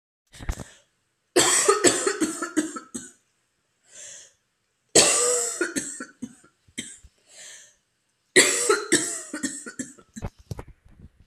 {"three_cough_length": "11.3 s", "three_cough_amplitude": 30637, "three_cough_signal_mean_std_ratio": 0.42, "survey_phase": "beta (2021-08-13 to 2022-03-07)", "age": "18-44", "gender": "Female", "wearing_mask": "No", "symptom_cough_any": true, "symptom_runny_or_blocked_nose": true, "symptom_fatigue": true, "symptom_headache": true, "symptom_other": true, "smoker_status": "Never smoked", "respiratory_condition_asthma": false, "respiratory_condition_other": false, "recruitment_source": "Test and Trace", "submission_delay": "2 days", "covid_test_result": "Positive", "covid_test_method": "RT-qPCR", "covid_ct_value": 19.3, "covid_ct_gene": "N gene", "covid_ct_mean": 19.9, "covid_viral_load": "300000 copies/ml", "covid_viral_load_category": "Low viral load (10K-1M copies/ml)"}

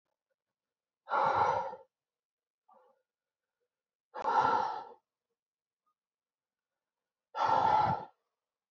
{"exhalation_length": "8.7 s", "exhalation_amplitude": 5243, "exhalation_signal_mean_std_ratio": 0.38, "survey_phase": "beta (2021-08-13 to 2022-03-07)", "age": "18-44", "gender": "Female", "wearing_mask": "No", "symptom_new_continuous_cough": true, "symptom_runny_or_blocked_nose": true, "symptom_sore_throat": true, "symptom_change_to_sense_of_smell_or_taste": true, "symptom_loss_of_taste": true, "symptom_other": true, "symptom_onset": "3 days", "smoker_status": "Never smoked", "respiratory_condition_asthma": false, "respiratory_condition_other": false, "recruitment_source": "Test and Trace", "submission_delay": "1 day", "covid_test_result": "Positive", "covid_test_method": "RT-qPCR", "covid_ct_value": 27.5, "covid_ct_gene": "N gene"}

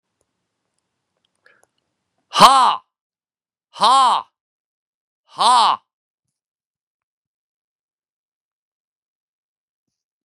{"exhalation_length": "10.2 s", "exhalation_amplitude": 32768, "exhalation_signal_mean_std_ratio": 0.25, "survey_phase": "beta (2021-08-13 to 2022-03-07)", "age": "45-64", "gender": "Male", "wearing_mask": "No", "symptom_cough_any": true, "symptom_runny_or_blocked_nose": true, "symptom_sore_throat": true, "symptom_fatigue": true, "symptom_headache": true, "symptom_other": true, "symptom_onset": "2 days", "smoker_status": "Never smoked", "respiratory_condition_asthma": false, "respiratory_condition_other": false, "recruitment_source": "Test and Trace", "submission_delay": "1 day", "covid_test_result": "Positive", "covid_test_method": "RT-qPCR", "covid_ct_value": 24.2, "covid_ct_gene": "N gene"}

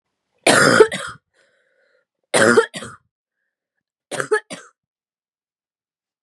{"three_cough_length": "6.2 s", "three_cough_amplitude": 32768, "three_cough_signal_mean_std_ratio": 0.31, "survey_phase": "beta (2021-08-13 to 2022-03-07)", "age": "18-44", "gender": "Female", "wearing_mask": "No", "symptom_cough_any": true, "symptom_runny_or_blocked_nose": true, "symptom_sore_throat": true, "symptom_fatigue": true, "symptom_headache": true, "smoker_status": "Current smoker (1 to 10 cigarettes per day)", "respiratory_condition_asthma": false, "respiratory_condition_other": false, "recruitment_source": "REACT", "submission_delay": "2 days", "covid_test_result": "Positive", "covid_test_method": "RT-qPCR", "covid_ct_value": 20.0, "covid_ct_gene": "E gene", "influenza_a_test_result": "Negative", "influenza_b_test_result": "Negative"}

